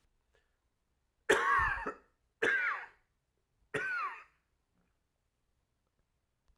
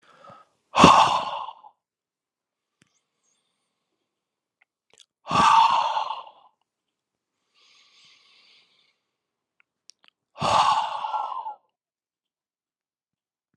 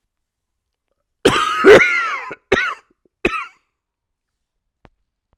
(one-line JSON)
{"three_cough_length": "6.6 s", "three_cough_amplitude": 6968, "three_cough_signal_mean_std_ratio": 0.37, "exhalation_length": "13.6 s", "exhalation_amplitude": 32767, "exhalation_signal_mean_std_ratio": 0.3, "cough_length": "5.4 s", "cough_amplitude": 32768, "cough_signal_mean_std_ratio": 0.34, "survey_phase": "alpha (2021-03-01 to 2021-08-12)", "age": "18-44", "gender": "Male", "wearing_mask": "No", "symptom_cough_any": true, "symptom_fever_high_temperature": true, "symptom_headache": true, "symptom_onset": "5 days", "smoker_status": "Never smoked", "respiratory_condition_asthma": true, "respiratory_condition_other": false, "recruitment_source": "Test and Trace", "submission_delay": "1 day", "covid_test_result": "Positive", "covid_test_method": "RT-qPCR", "covid_ct_value": 14.9, "covid_ct_gene": "ORF1ab gene", "covid_ct_mean": 15.3, "covid_viral_load": "9700000 copies/ml", "covid_viral_load_category": "High viral load (>1M copies/ml)"}